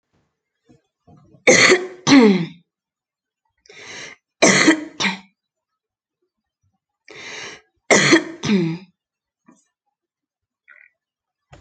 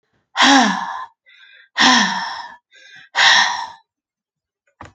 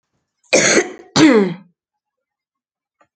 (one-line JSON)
{"three_cough_length": "11.6 s", "three_cough_amplitude": 31566, "three_cough_signal_mean_std_ratio": 0.33, "exhalation_length": "4.9 s", "exhalation_amplitude": 32768, "exhalation_signal_mean_std_ratio": 0.46, "cough_length": "3.2 s", "cough_amplitude": 30214, "cough_signal_mean_std_ratio": 0.39, "survey_phase": "alpha (2021-03-01 to 2021-08-12)", "age": "18-44", "gender": "Female", "wearing_mask": "No", "symptom_none": true, "smoker_status": "Never smoked", "respiratory_condition_asthma": false, "respiratory_condition_other": false, "recruitment_source": "REACT", "submission_delay": "2 days", "covid_test_result": "Negative", "covid_test_method": "RT-qPCR"}